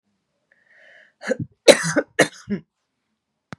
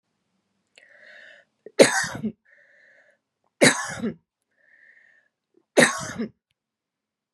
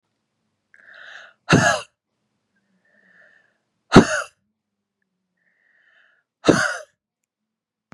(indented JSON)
{
  "cough_length": "3.6 s",
  "cough_amplitude": 32768,
  "cough_signal_mean_std_ratio": 0.25,
  "three_cough_length": "7.3 s",
  "three_cough_amplitude": 30500,
  "three_cough_signal_mean_std_ratio": 0.26,
  "exhalation_length": "7.9 s",
  "exhalation_amplitude": 32768,
  "exhalation_signal_mean_std_ratio": 0.22,
  "survey_phase": "beta (2021-08-13 to 2022-03-07)",
  "age": "18-44",
  "gender": "Female",
  "wearing_mask": "No",
  "symptom_none": true,
  "smoker_status": "Never smoked",
  "respiratory_condition_asthma": false,
  "respiratory_condition_other": false,
  "recruitment_source": "REACT",
  "submission_delay": "2 days",
  "covid_test_result": "Negative",
  "covid_test_method": "RT-qPCR",
  "influenza_a_test_result": "Unknown/Void",
  "influenza_b_test_result": "Unknown/Void"
}